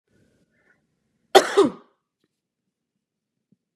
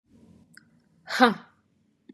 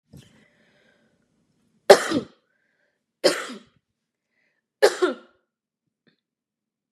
cough_length: 3.8 s
cough_amplitude: 32768
cough_signal_mean_std_ratio: 0.19
exhalation_length: 2.1 s
exhalation_amplitude: 27894
exhalation_signal_mean_std_ratio: 0.23
three_cough_length: 6.9 s
three_cough_amplitude: 32768
three_cough_signal_mean_std_ratio: 0.2
survey_phase: beta (2021-08-13 to 2022-03-07)
age: 18-44
gender: Female
wearing_mask: 'No'
symptom_none: true
symptom_onset: 12 days
smoker_status: Never smoked
respiratory_condition_asthma: false
respiratory_condition_other: false
recruitment_source: REACT
submission_delay: 2 days
covid_test_result: Negative
covid_test_method: RT-qPCR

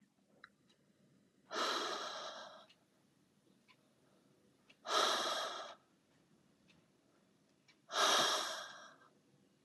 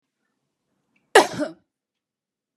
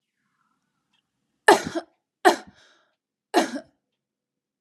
exhalation_length: 9.6 s
exhalation_amplitude: 3156
exhalation_signal_mean_std_ratio: 0.4
cough_length: 2.6 s
cough_amplitude: 32767
cough_signal_mean_std_ratio: 0.19
three_cough_length: 4.6 s
three_cough_amplitude: 30685
three_cough_signal_mean_std_ratio: 0.22
survey_phase: beta (2021-08-13 to 2022-03-07)
age: 18-44
gender: Female
wearing_mask: 'No'
symptom_none: true
smoker_status: Never smoked
respiratory_condition_asthma: false
respiratory_condition_other: false
recruitment_source: REACT
submission_delay: 1 day
covid_test_result: Negative
covid_test_method: RT-qPCR
influenza_a_test_result: Negative
influenza_b_test_result: Negative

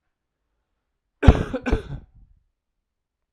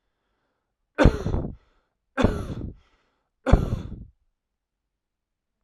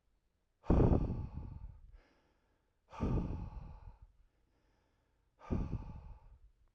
cough_length: 3.3 s
cough_amplitude: 32768
cough_signal_mean_std_ratio: 0.22
three_cough_length: 5.6 s
three_cough_amplitude: 29882
three_cough_signal_mean_std_ratio: 0.3
exhalation_length: 6.7 s
exhalation_amplitude: 4106
exhalation_signal_mean_std_ratio: 0.38
survey_phase: alpha (2021-03-01 to 2021-08-12)
age: 18-44
gender: Male
wearing_mask: 'No'
symptom_cough_any: true
symptom_new_continuous_cough: true
symptom_fever_high_temperature: true
symptom_onset: 4 days
smoker_status: Never smoked
respiratory_condition_asthma: false
respiratory_condition_other: false
recruitment_source: Test and Trace
submission_delay: 2 days
covid_test_result: Positive
covid_test_method: ePCR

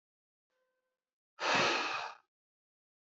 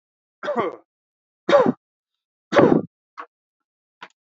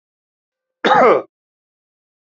exhalation_length: 3.2 s
exhalation_amplitude: 3986
exhalation_signal_mean_std_ratio: 0.37
three_cough_length: 4.4 s
three_cough_amplitude: 27924
three_cough_signal_mean_std_ratio: 0.32
cough_length: 2.2 s
cough_amplitude: 28392
cough_signal_mean_std_ratio: 0.33
survey_phase: alpha (2021-03-01 to 2021-08-12)
age: 18-44
gender: Male
wearing_mask: 'No'
symptom_none: true
smoker_status: Never smoked
respiratory_condition_asthma: false
respiratory_condition_other: false
recruitment_source: Test and Trace
submission_delay: 0 days
covid_test_result: Negative
covid_test_method: LFT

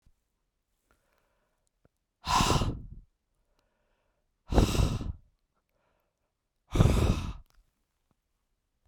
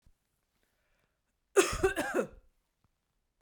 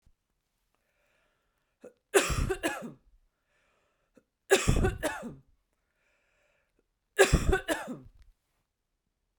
exhalation_length: 8.9 s
exhalation_amplitude: 15241
exhalation_signal_mean_std_ratio: 0.33
cough_length: 3.4 s
cough_amplitude: 12122
cough_signal_mean_std_ratio: 0.3
three_cough_length: 9.4 s
three_cough_amplitude: 18169
three_cough_signal_mean_std_ratio: 0.31
survey_phase: beta (2021-08-13 to 2022-03-07)
age: 45-64
gender: Female
wearing_mask: 'No'
symptom_none: true
smoker_status: Never smoked
respiratory_condition_asthma: false
respiratory_condition_other: false
recruitment_source: REACT
submission_delay: 0 days
covid_test_result: Negative
covid_test_method: RT-qPCR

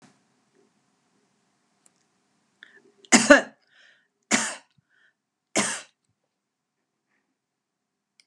three_cough_length: 8.3 s
three_cough_amplitude: 32767
three_cough_signal_mean_std_ratio: 0.18
survey_phase: beta (2021-08-13 to 2022-03-07)
age: 65+
gender: Female
wearing_mask: 'No'
symptom_abdominal_pain: true
symptom_fatigue: true
symptom_onset: 12 days
smoker_status: Never smoked
respiratory_condition_asthma: false
respiratory_condition_other: false
recruitment_source: REACT
submission_delay: 1 day
covid_test_result: Negative
covid_test_method: RT-qPCR
influenza_a_test_result: Negative
influenza_b_test_result: Negative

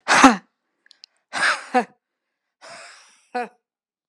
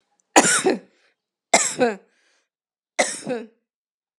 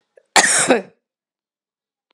exhalation_length: 4.1 s
exhalation_amplitude: 32768
exhalation_signal_mean_std_ratio: 0.29
three_cough_length: 4.2 s
three_cough_amplitude: 32767
three_cough_signal_mean_std_ratio: 0.35
cough_length: 2.1 s
cough_amplitude: 32768
cough_signal_mean_std_ratio: 0.35
survey_phase: alpha (2021-03-01 to 2021-08-12)
age: 45-64
gender: Female
wearing_mask: 'No'
symptom_headache: true
symptom_onset: 12 days
smoker_status: Never smoked
respiratory_condition_asthma: true
respiratory_condition_other: false
recruitment_source: REACT
submission_delay: 32 days
covid_test_result: Negative
covid_test_method: RT-qPCR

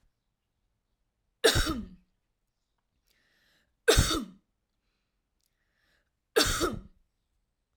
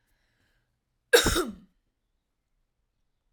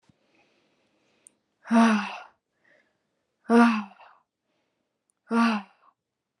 three_cough_length: 7.8 s
three_cough_amplitude: 12649
three_cough_signal_mean_std_ratio: 0.28
cough_length: 3.3 s
cough_amplitude: 16728
cough_signal_mean_std_ratio: 0.23
exhalation_length: 6.4 s
exhalation_amplitude: 14354
exhalation_signal_mean_std_ratio: 0.32
survey_phase: alpha (2021-03-01 to 2021-08-12)
age: 18-44
gender: Female
wearing_mask: 'No'
symptom_none: true
smoker_status: Ex-smoker
respiratory_condition_asthma: false
respiratory_condition_other: false
recruitment_source: REACT
submission_delay: 1 day
covid_test_result: Negative
covid_test_method: RT-qPCR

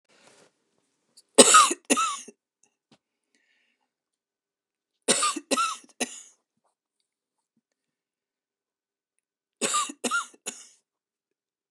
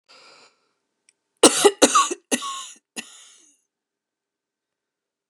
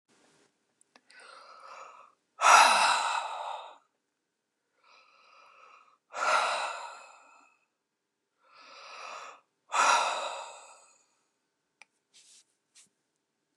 three_cough_length: 11.7 s
three_cough_amplitude: 29204
three_cough_signal_mean_std_ratio: 0.25
cough_length: 5.3 s
cough_amplitude: 29204
cough_signal_mean_std_ratio: 0.26
exhalation_length: 13.6 s
exhalation_amplitude: 16990
exhalation_signal_mean_std_ratio: 0.32
survey_phase: beta (2021-08-13 to 2022-03-07)
age: 65+
gender: Female
wearing_mask: 'No'
symptom_runny_or_blocked_nose: true
symptom_onset: 13 days
smoker_status: Ex-smoker
respiratory_condition_asthma: false
respiratory_condition_other: false
recruitment_source: REACT
submission_delay: 1 day
covid_test_result: Negative
covid_test_method: RT-qPCR
influenza_a_test_result: Negative
influenza_b_test_result: Negative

